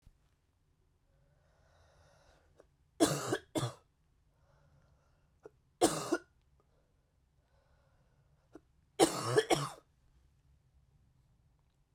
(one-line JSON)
{"three_cough_length": "11.9 s", "three_cough_amplitude": 8289, "three_cough_signal_mean_std_ratio": 0.25, "survey_phase": "beta (2021-08-13 to 2022-03-07)", "age": "18-44", "gender": "Female", "wearing_mask": "No", "symptom_cough_any": true, "symptom_new_continuous_cough": true, "symptom_change_to_sense_of_smell_or_taste": true, "symptom_loss_of_taste": true, "smoker_status": "Never smoked", "respiratory_condition_asthma": false, "respiratory_condition_other": false, "recruitment_source": "Test and Trace", "submission_delay": "2 days", "covid_test_result": "Positive", "covid_test_method": "LFT"}